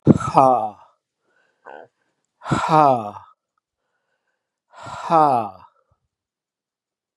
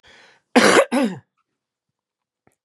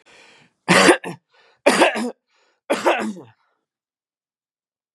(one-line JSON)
{"exhalation_length": "7.2 s", "exhalation_amplitude": 32768, "exhalation_signal_mean_std_ratio": 0.34, "cough_length": "2.6 s", "cough_amplitude": 32767, "cough_signal_mean_std_ratio": 0.34, "three_cough_length": "4.9 s", "three_cough_amplitude": 32665, "three_cough_signal_mean_std_ratio": 0.35, "survey_phase": "beta (2021-08-13 to 2022-03-07)", "age": "65+", "gender": "Male", "wearing_mask": "No", "symptom_cough_any": true, "symptom_runny_or_blocked_nose": true, "symptom_fatigue": true, "smoker_status": "Never smoked", "respiratory_condition_asthma": false, "respiratory_condition_other": false, "recruitment_source": "Test and Trace", "submission_delay": "2 days", "covid_test_result": "Positive", "covid_test_method": "RT-qPCR", "covid_ct_value": 23.2, "covid_ct_gene": "ORF1ab gene"}